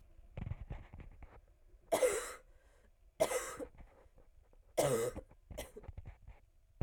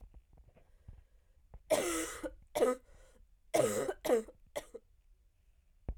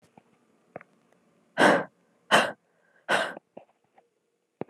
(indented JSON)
{
  "three_cough_length": "6.8 s",
  "three_cough_amplitude": 3803,
  "three_cough_signal_mean_std_ratio": 0.43,
  "cough_length": "6.0 s",
  "cough_amplitude": 4442,
  "cough_signal_mean_std_ratio": 0.42,
  "exhalation_length": "4.7 s",
  "exhalation_amplitude": 21256,
  "exhalation_signal_mean_std_ratio": 0.29,
  "survey_phase": "alpha (2021-03-01 to 2021-08-12)",
  "age": "18-44",
  "gender": "Female",
  "wearing_mask": "No",
  "symptom_cough_any": true,
  "symptom_fatigue": true,
  "symptom_headache": true,
  "symptom_change_to_sense_of_smell_or_taste": true,
  "symptom_onset": "4 days",
  "smoker_status": "Never smoked",
  "respiratory_condition_asthma": false,
  "respiratory_condition_other": false,
  "recruitment_source": "Test and Trace",
  "submission_delay": "2 days",
  "covid_test_result": "Positive",
  "covid_test_method": "RT-qPCR",
  "covid_ct_value": 16.3,
  "covid_ct_gene": "ORF1ab gene",
  "covid_ct_mean": 16.7,
  "covid_viral_load": "3200000 copies/ml",
  "covid_viral_load_category": "High viral load (>1M copies/ml)"
}